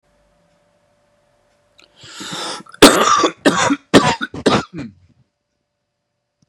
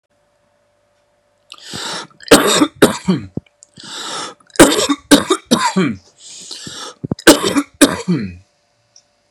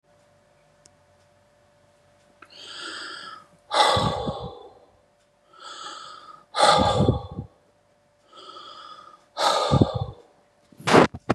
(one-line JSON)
{"cough_length": "6.5 s", "cough_amplitude": 32768, "cough_signal_mean_std_ratio": 0.35, "three_cough_length": "9.3 s", "three_cough_amplitude": 32768, "three_cough_signal_mean_std_ratio": 0.4, "exhalation_length": "11.3 s", "exhalation_amplitude": 31616, "exhalation_signal_mean_std_ratio": 0.38, "survey_phase": "beta (2021-08-13 to 2022-03-07)", "age": "45-64", "gender": "Male", "wearing_mask": "No", "symptom_cough_any": true, "symptom_onset": "8 days", "smoker_status": "Current smoker (1 to 10 cigarettes per day)", "respiratory_condition_asthma": false, "respiratory_condition_other": false, "recruitment_source": "REACT", "submission_delay": "1 day", "covid_test_result": "Negative", "covid_test_method": "RT-qPCR", "influenza_a_test_result": "Negative", "influenza_b_test_result": "Negative"}